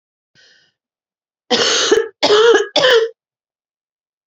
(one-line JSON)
{"three_cough_length": "4.3 s", "three_cough_amplitude": 31134, "three_cough_signal_mean_std_ratio": 0.47, "survey_phase": "beta (2021-08-13 to 2022-03-07)", "age": "45-64", "gender": "Female", "wearing_mask": "No", "symptom_cough_any": true, "symptom_runny_or_blocked_nose": true, "symptom_fatigue": true, "symptom_fever_high_temperature": true, "symptom_headache": true, "symptom_change_to_sense_of_smell_or_taste": true, "symptom_loss_of_taste": true, "symptom_other": true, "symptom_onset": "4 days", "smoker_status": "Ex-smoker", "respiratory_condition_asthma": false, "respiratory_condition_other": false, "recruitment_source": "Test and Trace", "submission_delay": "3 days", "covid_test_result": "Positive", "covid_test_method": "RT-qPCR", "covid_ct_value": 19.5, "covid_ct_gene": "ORF1ab gene", "covid_ct_mean": 19.7, "covid_viral_load": "340000 copies/ml", "covid_viral_load_category": "Low viral load (10K-1M copies/ml)"}